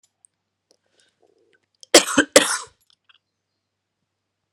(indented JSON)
{
  "cough_length": "4.5 s",
  "cough_amplitude": 32768,
  "cough_signal_mean_std_ratio": 0.2,
  "survey_phase": "beta (2021-08-13 to 2022-03-07)",
  "age": "45-64",
  "gender": "Female",
  "wearing_mask": "No",
  "symptom_cough_any": true,
  "symptom_runny_or_blocked_nose": true,
  "symptom_sore_throat": true,
  "smoker_status": "Never smoked",
  "respiratory_condition_asthma": false,
  "respiratory_condition_other": false,
  "recruitment_source": "Test and Trace",
  "submission_delay": "1 day",
  "covid_test_result": "Positive",
  "covid_test_method": "LFT"
}